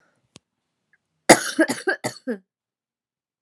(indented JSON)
{
  "three_cough_length": "3.4 s",
  "three_cough_amplitude": 32768,
  "three_cough_signal_mean_std_ratio": 0.25,
  "survey_phase": "alpha (2021-03-01 to 2021-08-12)",
  "age": "18-44",
  "gender": "Female",
  "wearing_mask": "No",
  "symptom_cough_any": true,
  "symptom_new_continuous_cough": true,
  "symptom_fatigue": true,
  "symptom_headache": true,
  "symptom_onset": "3 days",
  "smoker_status": "Never smoked",
  "respiratory_condition_asthma": false,
  "respiratory_condition_other": false,
  "recruitment_source": "Test and Trace",
  "submission_delay": "2 days",
  "covid_test_result": "Positive",
  "covid_test_method": "RT-qPCR"
}